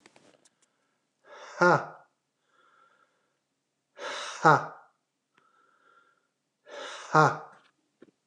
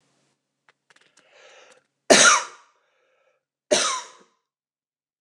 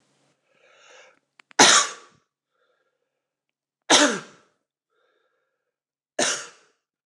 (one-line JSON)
{"exhalation_length": "8.3 s", "exhalation_amplitude": 19532, "exhalation_signal_mean_std_ratio": 0.24, "cough_length": "5.2 s", "cough_amplitude": 29204, "cough_signal_mean_std_ratio": 0.26, "three_cough_length": "7.1 s", "three_cough_amplitude": 29203, "three_cough_signal_mean_std_ratio": 0.25, "survey_phase": "alpha (2021-03-01 to 2021-08-12)", "age": "45-64", "gender": "Male", "wearing_mask": "No", "symptom_none": true, "smoker_status": "Never smoked", "respiratory_condition_asthma": false, "respiratory_condition_other": false, "recruitment_source": "REACT", "submission_delay": "3 days", "covid_test_result": "Negative", "covid_test_method": "RT-qPCR"}